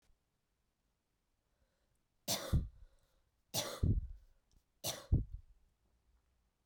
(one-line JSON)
{"three_cough_length": "6.7 s", "three_cough_amplitude": 3215, "three_cough_signal_mean_std_ratio": 0.31, "survey_phase": "beta (2021-08-13 to 2022-03-07)", "age": "18-44", "gender": "Female", "wearing_mask": "No", "symptom_runny_or_blocked_nose": true, "symptom_headache": true, "symptom_onset": "3 days", "smoker_status": "Ex-smoker", "respiratory_condition_asthma": false, "respiratory_condition_other": false, "recruitment_source": "Test and Trace", "submission_delay": "2 days", "covid_test_result": "Positive", "covid_test_method": "RT-qPCR"}